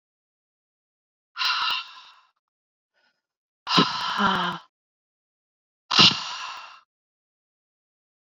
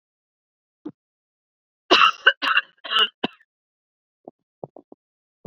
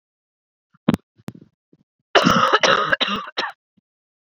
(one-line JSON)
{"exhalation_length": "8.4 s", "exhalation_amplitude": 28392, "exhalation_signal_mean_std_ratio": 0.32, "cough_length": "5.5 s", "cough_amplitude": 29026, "cough_signal_mean_std_ratio": 0.26, "three_cough_length": "4.4 s", "three_cough_amplitude": 28310, "three_cough_signal_mean_std_ratio": 0.38, "survey_phase": "beta (2021-08-13 to 2022-03-07)", "age": "45-64", "gender": "Female", "wearing_mask": "No", "symptom_cough_any": true, "symptom_runny_or_blocked_nose": true, "symptom_fatigue": true, "symptom_headache": true, "symptom_change_to_sense_of_smell_or_taste": true, "smoker_status": "Current smoker (1 to 10 cigarettes per day)", "respiratory_condition_asthma": false, "respiratory_condition_other": false, "recruitment_source": "Test and Trace", "submission_delay": "3 days", "covid_test_result": "Positive", "covid_test_method": "LFT"}